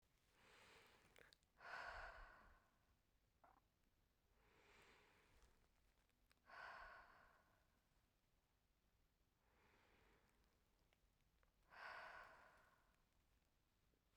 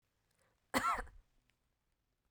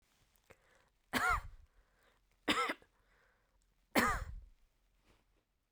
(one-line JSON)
{"exhalation_length": "14.2 s", "exhalation_amplitude": 234, "exhalation_signal_mean_std_ratio": 0.49, "cough_length": "2.3 s", "cough_amplitude": 4201, "cough_signal_mean_std_ratio": 0.29, "three_cough_length": "5.7 s", "three_cough_amplitude": 7058, "three_cough_signal_mean_std_ratio": 0.33, "survey_phase": "beta (2021-08-13 to 2022-03-07)", "age": "45-64", "gender": "Female", "wearing_mask": "No", "symptom_sore_throat": true, "symptom_fatigue": true, "symptom_onset": "5 days", "smoker_status": "Never smoked", "respiratory_condition_asthma": false, "respiratory_condition_other": false, "recruitment_source": "REACT", "submission_delay": "1 day", "covid_test_result": "Negative", "covid_test_method": "RT-qPCR"}